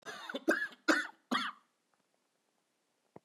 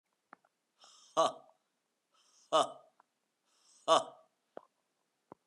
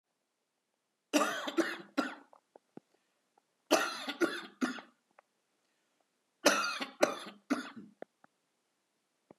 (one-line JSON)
{"cough_length": "3.2 s", "cough_amplitude": 5756, "cough_signal_mean_std_ratio": 0.36, "exhalation_length": "5.5 s", "exhalation_amplitude": 6927, "exhalation_signal_mean_std_ratio": 0.23, "three_cough_length": "9.4 s", "three_cough_amplitude": 12240, "three_cough_signal_mean_std_ratio": 0.34, "survey_phase": "beta (2021-08-13 to 2022-03-07)", "age": "45-64", "gender": "Male", "wearing_mask": "No", "symptom_new_continuous_cough": true, "symptom_runny_or_blocked_nose": true, "symptom_sore_throat": true, "symptom_fatigue": true, "symptom_headache": true, "symptom_onset": "4 days", "smoker_status": "Never smoked", "respiratory_condition_asthma": false, "respiratory_condition_other": false, "recruitment_source": "Test and Trace", "submission_delay": "1 day", "covid_test_result": "Positive", "covid_test_method": "RT-qPCR", "covid_ct_value": 20.5, "covid_ct_gene": "ORF1ab gene"}